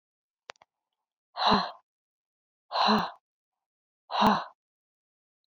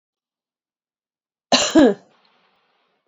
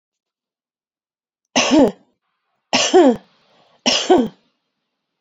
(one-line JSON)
{"exhalation_length": "5.5 s", "exhalation_amplitude": 9948, "exhalation_signal_mean_std_ratio": 0.33, "cough_length": "3.1 s", "cough_amplitude": 30598, "cough_signal_mean_std_ratio": 0.27, "three_cough_length": "5.2 s", "three_cough_amplitude": 29171, "three_cough_signal_mean_std_ratio": 0.37, "survey_phase": "beta (2021-08-13 to 2022-03-07)", "age": "45-64", "gender": "Female", "wearing_mask": "No", "symptom_none": true, "smoker_status": "Never smoked", "respiratory_condition_asthma": false, "respiratory_condition_other": false, "recruitment_source": "REACT", "submission_delay": "1 day", "covid_test_result": "Negative", "covid_test_method": "RT-qPCR"}